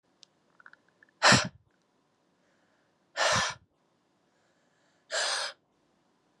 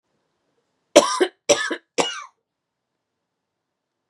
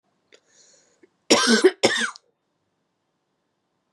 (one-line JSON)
{"exhalation_length": "6.4 s", "exhalation_amplitude": 13949, "exhalation_signal_mean_std_ratio": 0.28, "three_cough_length": "4.1 s", "three_cough_amplitude": 32768, "three_cough_signal_mean_std_ratio": 0.26, "cough_length": "3.9 s", "cough_amplitude": 29029, "cough_signal_mean_std_ratio": 0.3, "survey_phase": "beta (2021-08-13 to 2022-03-07)", "age": "18-44", "gender": "Female", "wearing_mask": "No", "symptom_none": true, "symptom_onset": "12 days", "smoker_status": "Never smoked", "respiratory_condition_asthma": true, "respiratory_condition_other": false, "recruitment_source": "REACT", "submission_delay": "3 days", "covid_test_result": "Negative", "covid_test_method": "RT-qPCR", "influenza_a_test_result": "Negative", "influenza_b_test_result": "Negative"}